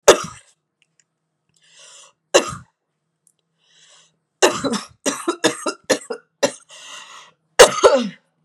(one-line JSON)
{"three_cough_length": "8.4 s", "three_cough_amplitude": 32768, "three_cough_signal_mean_std_ratio": 0.29, "survey_phase": "beta (2021-08-13 to 2022-03-07)", "age": "45-64", "gender": "Female", "wearing_mask": "No", "symptom_cough_any": true, "symptom_sore_throat": true, "symptom_fatigue": true, "symptom_fever_high_temperature": true, "symptom_headache": true, "symptom_onset": "7 days", "smoker_status": "Never smoked", "respiratory_condition_asthma": true, "respiratory_condition_other": false, "recruitment_source": "Test and Trace", "submission_delay": "2 days", "covid_test_result": "Positive", "covid_test_method": "RT-qPCR", "covid_ct_value": 22.6, "covid_ct_gene": "ORF1ab gene", "covid_ct_mean": 22.9, "covid_viral_load": "30000 copies/ml", "covid_viral_load_category": "Low viral load (10K-1M copies/ml)"}